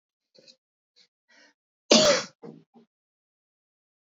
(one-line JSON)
{"cough_length": "4.2 s", "cough_amplitude": 22385, "cough_signal_mean_std_ratio": 0.22, "survey_phase": "beta (2021-08-13 to 2022-03-07)", "age": "18-44", "gender": "Female", "wearing_mask": "No", "symptom_runny_or_blocked_nose": true, "symptom_shortness_of_breath": true, "symptom_sore_throat": true, "symptom_abdominal_pain": true, "symptom_fatigue": true, "symptom_headache": true, "smoker_status": "Ex-smoker", "respiratory_condition_asthma": false, "respiratory_condition_other": false, "recruitment_source": "Test and Trace", "submission_delay": "2 days", "covid_test_result": "Positive", "covid_test_method": "RT-qPCR", "covid_ct_value": 16.4, "covid_ct_gene": "ORF1ab gene", "covid_ct_mean": 16.4, "covid_viral_load": "4000000 copies/ml", "covid_viral_load_category": "High viral load (>1M copies/ml)"}